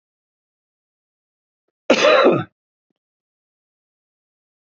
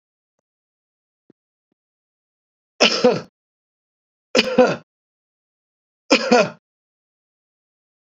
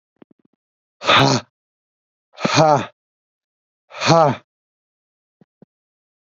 {
  "cough_length": "4.6 s",
  "cough_amplitude": 27866,
  "cough_signal_mean_std_ratio": 0.27,
  "three_cough_length": "8.1 s",
  "three_cough_amplitude": 32768,
  "three_cough_signal_mean_std_ratio": 0.26,
  "exhalation_length": "6.2 s",
  "exhalation_amplitude": 28376,
  "exhalation_signal_mean_std_ratio": 0.32,
  "survey_phase": "beta (2021-08-13 to 2022-03-07)",
  "age": "45-64",
  "gender": "Male",
  "wearing_mask": "No",
  "symptom_none": true,
  "smoker_status": "Ex-smoker",
  "respiratory_condition_asthma": true,
  "respiratory_condition_other": false,
  "recruitment_source": "REACT",
  "submission_delay": "1 day",
  "covid_test_result": "Negative",
  "covid_test_method": "RT-qPCR",
  "influenza_a_test_result": "Unknown/Void",
  "influenza_b_test_result": "Unknown/Void"
}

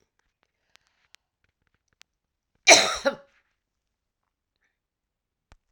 {
  "cough_length": "5.7 s",
  "cough_amplitude": 32767,
  "cough_signal_mean_std_ratio": 0.17,
  "survey_phase": "alpha (2021-03-01 to 2021-08-12)",
  "age": "65+",
  "gender": "Female",
  "wearing_mask": "No",
  "symptom_cough_any": true,
  "symptom_abdominal_pain": true,
  "symptom_headache": true,
  "symptom_change_to_sense_of_smell_or_taste": true,
  "smoker_status": "Never smoked",
  "respiratory_condition_asthma": false,
  "respiratory_condition_other": false,
  "recruitment_source": "Test and Trace",
  "submission_delay": "2 days",
  "covid_test_result": "Positive",
  "covid_test_method": "RT-qPCR"
}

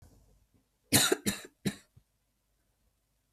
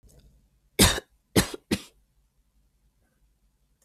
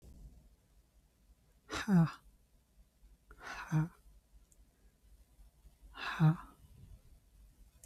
{
  "three_cough_length": "3.3 s",
  "three_cough_amplitude": 12893,
  "three_cough_signal_mean_std_ratio": 0.27,
  "cough_length": "3.8 s",
  "cough_amplitude": 22892,
  "cough_signal_mean_std_ratio": 0.23,
  "exhalation_length": "7.9 s",
  "exhalation_amplitude": 3692,
  "exhalation_signal_mean_std_ratio": 0.3,
  "survey_phase": "beta (2021-08-13 to 2022-03-07)",
  "age": "45-64",
  "gender": "Female",
  "wearing_mask": "No",
  "symptom_none": true,
  "smoker_status": "Never smoked",
  "respiratory_condition_asthma": false,
  "respiratory_condition_other": false,
  "recruitment_source": "REACT",
  "submission_delay": "1 day",
  "covid_test_result": "Negative",
  "covid_test_method": "RT-qPCR",
  "influenza_a_test_result": "Negative",
  "influenza_b_test_result": "Negative"
}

